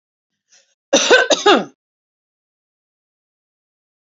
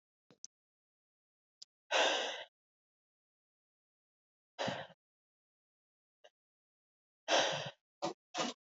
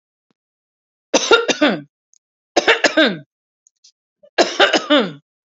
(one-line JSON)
{"cough_length": "4.2 s", "cough_amplitude": 32768, "cough_signal_mean_std_ratio": 0.29, "exhalation_length": "8.6 s", "exhalation_amplitude": 3880, "exhalation_signal_mean_std_ratio": 0.3, "three_cough_length": "5.5 s", "three_cough_amplitude": 32767, "three_cough_signal_mean_std_ratio": 0.39, "survey_phase": "alpha (2021-03-01 to 2021-08-12)", "age": "18-44", "gender": "Female", "wearing_mask": "No", "symptom_change_to_sense_of_smell_or_taste": true, "symptom_loss_of_taste": true, "smoker_status": "Ex-smoker", "respiratory_condition_asthma": false, "respiratory_condition_other": false, "recruitment_source": "REACT", "submission_delay": "2 days", "covid_test_result": "Negative", "covid_test_method": "RT-qPCR"}